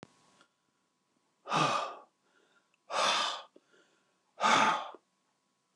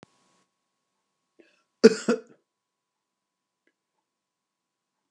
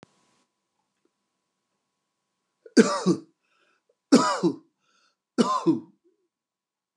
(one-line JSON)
{"exhalation_length": "5.8 s", "exhalation_amplitude": 7420, "exhalation_signal_mean_std_ratio": 0.39, "cough_length": "5.1 s", "cough_amplitude": 28953, "cough_signal_mean_std_ratio": 0.13, "three_cough_length": "7.0 s", "three_cough_amplitude": 26540, "three_cough_signal_mean_std_ratio": 0.28, "survey_phase": "beta (2021-08-13 to 2022-03-07)", "age": "65+", "gender": "Male", "wearing_mask": "No", "symptom_none": true, "smoker_status": "Never smoked", "respiratory_condition_asthma": false, "respiratory_condition_other": false, "recruitment_source": "REACT", "submission_delay": "1 day", "covid_test_result": "Negative", "covid_test_method": "RT-qPCR", "influenza_a_test_result": "Unknown/Void", "influenza_b_test_result": "Unknown/Void"}